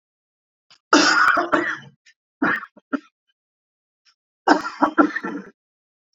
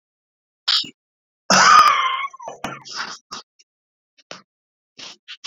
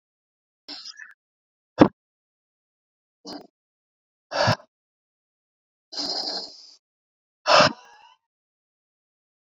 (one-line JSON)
{"three_cough_length": "6.1 s", "three_cough_amplitude": 30426, "three_cough_signal_mean_std_ratio": 0.39, "cough_length": "5.5 s", "cough_amplitude": 29894, "cough_signal_mean_std_ratio": 0.35, "exhalation_length": "9.6 s", "exhalation_amplitude": 32415, "exhalation_signal_mean_std_ratio": 0.22, "survey_phase": "beta (2021-08-13 to 2022-03-07)", "age": "45-64", "gender": "Male", "wearing_mask": "No", "symptom_none": true, "smoker_status": "Never smoked", "respiratory_condition_asthma": false, "respiratory_condition_other": false, "recruitment_source": "REACT", "submission_delay": "2 days", "covid_test_result": "Negative", "covid_test_method": "RT-qPCR"}